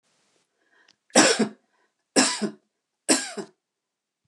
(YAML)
three_cough_length: 4.3 s
three_cough_amplitude: 26366
three_cough_signal_mean_std_ratio: 0.32
survey_phase: beta (2021-08-13 to 2022-03-07)
age: 65+
gender: Female
wearing_mask: 'No'
symptom_none: true
smoker_status: Never smoked
respiratory_condition_asthma: false
respiratory_condition_other: false
recruitment_source: REACT
submission_delay: 1 day
covid_test_result: Negative
covid_test_method: RT-qPCR